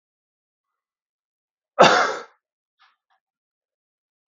{
  "cough_length": "4.3 s",
  "cough_amplitude": 32768,
  "cough_signal_mean_std_ratio": 0.21,
  "survey_phase": "beta (2021-08-13 to 2022-03-07)",
  "age": "18-44",
  "gender": "Male",
  "wearing_mask": "No",
  "symptom_none": true,
  "smoker_status": "Ex-smoker",
  "respiratory_condition_asthma": false,
  "respiratory_condition_other": false,
  "recruitment_source": "REACT",
  "submission_delay": "3 days",
  "covid_test_result": "Negative",
  "covid_test_method": "RT-qPCR",
  "influenza_a_test_result": "Negative",
  "influenza_b_test_result": "Negative"
}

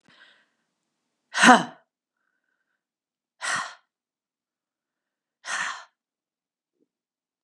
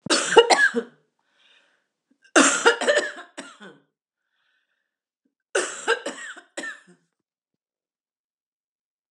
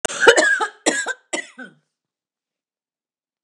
{
  "exhalation_length": "7.4 s",
  "exhalation_amplitude": 32484,
  "exhalation_signal_mean_std_ratio": 0.19,
  "three_cough_length": "9.1 s",
  "three_cough_amplitude": 32767,
  "three_cough_signal_mean_std_ratio": 0.31,
  "cough_length": "3.4 s",
  "cough_amplitude": 32768,
  "cough_signal_mean_std_ratio": 0.36,
  "survey_phase": "beta (2021-08-13 to 2022-03-07)",
  "age": "65+",
  "gender": "Female",
  "wearing_mask": "No",
  "symptom_none": true,
  "smoker_status": "Ex-smoker",
  "respiratory_condition_asthma": false,
  "respiratory_condition_other": false,
  "recruitment_source": "REACT",
  "submission_delay": "1 day",
  "covid_test_result": "Negative",
  "covid_test_method": "RT-qPCR",
  "influenza_a_test_result": "Negative",
  "influenza_b_test_result": "Negative"
}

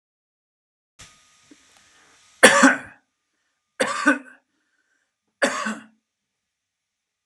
{
  "three_cough_length": "7.3 s",
  "three_cough_amplitude": 32768,
  "three_cough_signal_mean_std_ratio": 0.25,
  "survey_phase": "beta (2021-08-13 to 2022-03-07)",
  "age": "18-44",
  "gender": "Male",
  "wearing_mask": "No",
  "symptom_none": true,
  "smoker_status": "Current smoker (1 to 10 cigarettes per day)",
  "respiratory_condition_asthma": false,
  "respiratory_condition_other": false,
  "recruitment_source": "REACT",
  "submission_delay": "1 day",
  "covid_test_result": "Negative",
  "covid_test_method": "RT-qPCR"
}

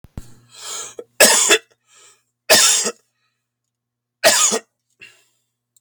{
  "three_cough_length": "5.8 s",
  "three_cough_amplitude": 32768,
  "three_cough_signal_mean_std_ratio": 0.38,
  "survey_phase": "beta (2021-08-13 to 2022-03-07)",
  "age": "45-64",
  "gender": "Male",
  "wearing_mask": "No",
  "symptom_none": true,
  "smoker_status": "Never smoked",
  "respiratory_condition_asthma": true,
  "respiratory_condition_other": false,
  "recruitment_source": "REACT",
  "submission_delay": "2 days",
  "covid_test_result": "Negative",
  "covid_test_method": "RT-qPCR",
  "covid_ct_value": 38.0,
  "covid_ct_gene": "N gene"
}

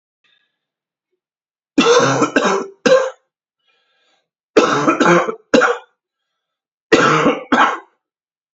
{
  "three_cough_length": "8.5 s",
  "three_cough_amplitude": 32220,
  "three_cough_signal_mean_std_ratio": 0.46,
  "survey_phase": "beta (2021-08-13 to 2022-03-07)",
  "age": "18-44",
  "gender": "Male",
  "wearing_mask": "No",
  "symptom_cough_any": true,
  "symptom_runny_or_blocked_nose": true,
  "symptom_sore_throat": true,
  "symptom_fatigue": true,
  "symptom_onset": "2 days",
  "smoker_status": "Never smoked",
  "respiratory_condition_asthma": false,
  "respiratory_condition_other": false,
  "recruitment_source": "Test and Trace",
  "submission_delay": "1 day",
  "covid_test_result": "Positive",
  "covid_test_method": "RT-qPCR",
  "covid_ct_value": 27.4,
  "covid_ct_gene": "ORF1ab gene"
}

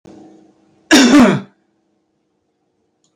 {
  "cough_length": "3.2 s",
  "cough_amplitude": 32768,
  "cough_signal_mean_std_ratio": 0.35,
  "survey_phase": "beta (2021-08-13 to 2022-03-07)",
  "age": "65+",
  "gender": "Male",
  "wearing_mask": "No",
  "symptom_cough_any": true,
  "smoker_status": "Ex-smoker",
  "respiratory_condition_asthma": false,
  "respiratory_condition_other": true,
  "recruitment_source": "REACT",
  "submission_delay": "5 days",
  "covid_test_result": "Negative",
  "covid_test_method": "RT-qPCR",
  "covid_ct_value": 37.0,
  "covid_ct_gene": "E gene"
}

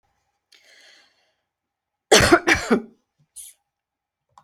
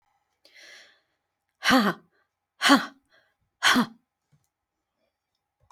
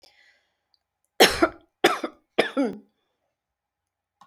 {
  "cough_length": "4.4 s",
  "cough_amplitude": 32767,
  "cough_signal_mean_std_ratio": 0.27,
  "exhalation_length": "5.7 s",
  "exhalation_amplitude": 21520,
  "exhalation_signal_mean_std_ratio": 0.28,
  "three_cough_length": "4.3 s",
  "three_cough_amplitude": 27797,
  "three_cough_signal_mean_std_ratio": 0.27,
  "survey_phase": "alpha (2021-03-01 to 2021-08-12)",
  "age": "65+",
  "gender": "Female",
  "wearing_mask": "No",
  "symptom_none": true,
  "smoker_status": "Never smoked",
  "respiratory_condition_asthma": false,
  "respiratory_condition_other": false,
  "recruitment_source": "REACT",
  "submission_delay": "5 days",
  "covid_test_result": "Negative",
  "covid_test_method": "RT-qPCR"
}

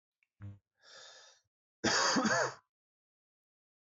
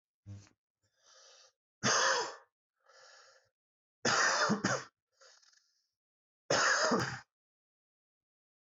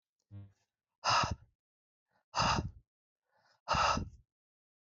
{
  "cough_length": "3.8 s",
  "cough_amplitude": 3802,
  "cough_signal_mean_std_ratio": 0.37,
  "three_cough_length": "8.8 s",
  "three_cough_amplitude": 4993,
  "three_cough_signal_mean_std_ratio": 0.39,
  "exhalation_length": "4.9 s",
  "exhalation_amplitude": 4435,
  "exhalation_signal_mean_std_ratio": 0.37,
  "survey_phase": "alpha (2021-03-01 to 2021-08-12)",
  "age": "18-44",
  "gender": "Male",
  "wearing_mask": "No",
  "symptom_cough_any": true,
  "symptom_fatigue": true,
  "symptom_fever_high_temperature": true,
  "symptom_headache": true,
  "symptom_onset": "2 days",
  "smoker_status": "Ex-smoker",
  "respiratory_condition_asthma": false,
  "respiratory_condition_other": false,
  "recruitment_source": "Test and Trace",
  "submission_delay": "1 day",
  "covid_test_result": "Positive",
  "covid_test_method": "RT-qPCR",
  "covid_ct_value": 15.7,
  "covid_ct_gene": "N gene",
  "covid_ct_mean": 16.1,
  "covid_viral_load": "5400000 copies/ml",
  "covid_viral_load_category": "High viral load (>1M copies/ml)"
}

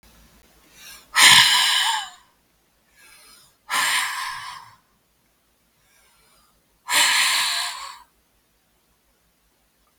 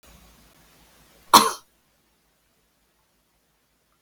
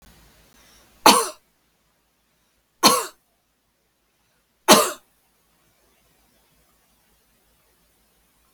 {
  "exhalation_length": "10.0 s",
  "exhalation_amplitude": 32768,
  "exhalation_signal_mean_std_ratio": 0.38,
  "cough_length": "4.0 s",
  "cough_amplitude": 32768,
  "cough_signal_mean_std_ratio": 0.16,
  "three_cough_length": "8.5 s",
  "three_cough_amplitude": 32768,
  "three_cough_signal_mean_std_ratio": 0.2,
  "survey_phase": "beta (2021-08-13 to 2022-03-07)",
  "age": "45-64",
  "gender": "Female",
  "wearing_mask": "No",
  "symptom_none": true,
  "smoker_status": "Never smoked",
  "respiratory_condition_asthma": false,
  "respiratory_condition_other": false,
  "recruitment_source": "REACT",
  "submission_delay": "1 day",
  "covid_test_result": "Negative",
  "covid_test_method": "RT-qPCR"
}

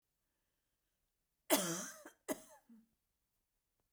{
  "cough_length": "3.9 s",
  "cough_amplitude": 4702,
  "cough_signal_mean_std_ratio": 0.25,
  "survey_phase": "beta (2021-08-13 to 2022-03-07)",
  "age": "65+",
  "gender": "Female",
  "wearing_mask": "No",
  "symptom_none": true,
  "smoker_status": "Ex-smoker",
  "respiratory_condition_asthma": false,
  "respiratory_condition_other": false,
  "recruitment_source": "REACT",
  "submission_delay": "2 days",
  "covid_test_result": "Negative",
  "covid_test_method": "RT-qPCR"
}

